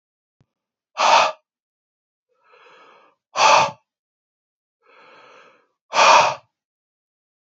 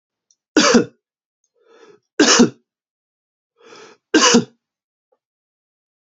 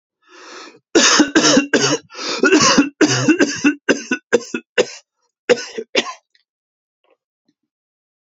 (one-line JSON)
{"exhalation_length": "7.6 s", "exhalation_amplitude": 27769, "exhalation_signal_mean_std_ratio": 0.3, "three_cough_length": "6.1 s", "three_cough_amplitude": 31635, "three_cough_signal_mean_std_ratio": 0.3, "cough_length": "8.4 s", "cough_amplitude": 32768, "cough_signal_mean_std_ratio": 0.47, "survey_phase": "beta (2021-08-13 to 2022-03-07)", "age": "18-44", "gender": "Male", "wearing_mask": "No", "symptom_none": true, "symptom_onset": "12 days", "smoker_status": "Ex-smoker", "respiratory_condition_asthma": false, "respiratory_condition_other": false, "recruitment_source": "REACT", "submission_delay": "1 day", "covid_test_result": "Negative", "covid_test_method": "RT-qPCR", "influenza_a_test_result": "Unknown/Void", "influenza_b_test_result": "Unknown/Void"}